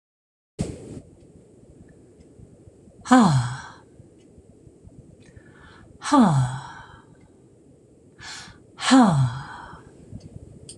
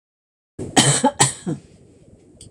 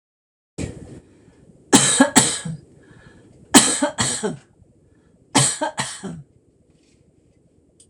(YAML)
exhalation_length: 10.8 s
exhalation_amplitude: 25879
exhalation_signal_mean_std_ratio: 0.35
cough_length: 2.5 s
cough_amplitude: 26028
cough_signal_mean_std_ratio: 0.39
three_cough_length: 7.9 s
three_cough_amplitude: 26028
three_cough_signal_mean_std_ratio: 0.36
survey_phase: beta (2021-08-13 to 2022-03-07)
age: 45-64
gender: Female
wearing_mask: 'No'
symptom_none: true
smoker_status: Ex-smoker
respiratory_condition_asthma: false
respiratory_condition_other: false
recruitment_source: REACT
submission_delay: 1 day
covid_test_result: Negative
covid_test_method: RT-qPCR